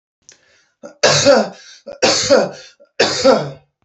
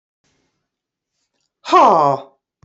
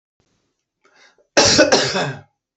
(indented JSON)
{
  "three_cough_length": "3.8 s",
  "three_cough_amplitude": 30998,
  "three_cough_signal_mean_std_ratio": 0.51,
  "exhalation_length": "2.6 s",
  "exhalation_amplitude": 30379,
  "exhalation_signal_mean_std_ratio": 0.34,
  "cough_length": "2.6 s",
  "cough_amplitude": 30089,
  "cough_signal_mean_std_ratio": 0.42,
  "survey_phase": "beta (2021-08-13 to 2022-03-07)",
  "age": "45-64",
  "gender": "Female",
  "wearing_mask": "No",
  "symptom_none": true,
  "smoker_status": "Never smoked",
  "respiratory_condition_asthma": false,
  "respiratory_condition_other": false,
  "recruitment_source": "REACT",
  "submission_delay": "5 days",
  "covid_test_result": "Negative",
  "covid_test_method": "RT-qPCR",
  "influenza_a_test_result": "Negative",
  "influenza_b_test_result": "Negative"
}